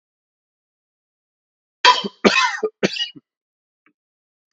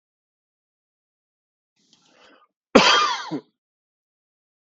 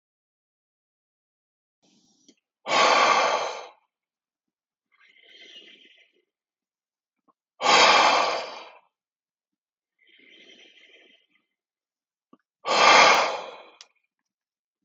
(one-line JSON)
{"three_cough_length": "4.5 s", "three_cough_amplitude": 32768, "three_cough_signal_mean_std_ratio": 0.28, "cough_length": "4.6 s", "cough_amplitude": 32766, "cough_signal_mean_std_ratio": 0.24, "exhalation_length": "14.8 s", "exhalation_amplitude": 31964, "exhalation_signal_mean_std_ratio": 0.32, "survey_phase": "beta (2021-08-13 to 2022-03-07)", "age": "45-64", "gender": "Male", "wearing_mask": "No", "symptom_none": true, "smoker_status": "Never smoked", "respiratory_condition_asthma": false, "respiratory_condition_other": false, "recruitment_source": "REACT", "submission_delay": "1 day", "covid_test_result": "Negative", "covid_test_method": "RT-qPCR"}